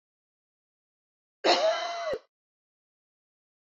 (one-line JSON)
{"cough_length": "3.8 s", "cough_amplitude": 10631, "cough_signal_mean_std_ratio": 0.33, "survey_phase": "beta (2021-08-13 to 2022-03-07)", "age": "45-64", "gender": "Female", "wearing_mask": "No", "symptom_cough_any": true, "smoker_status": "Never smoked", "respiratory_condition_asthma": true, "respiratory_condition_other": false, "recruitment_source": "Test and Trace", "submission_delay": "2 days", "covid_test_result": "Positive", "covid_test_method": "RT-qPCR", "covid_ct_value": 35.3, "covid_ct_gene": "ORF1ab gene"}